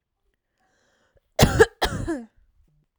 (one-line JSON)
{"cough_length": "3.0 s", "cough_amplitude": 32767, "cough_signal_mean_std_ratio": 0.29, "survey_phase": "alpha (2021-03-01 to 2021-08-12)", "age": "18-44", "gender": "Female", "wearing_mask": "No", "symptom_none": true, "smoker_status": "Never smoked", "respiratory_condition_asthma": false, "respiratory_condition_other": false, "recruitment_source": "REACT", "submission_delay": "2 days", "covid_test_result": "Negative", "covid_test_method": "RT-qPCR"}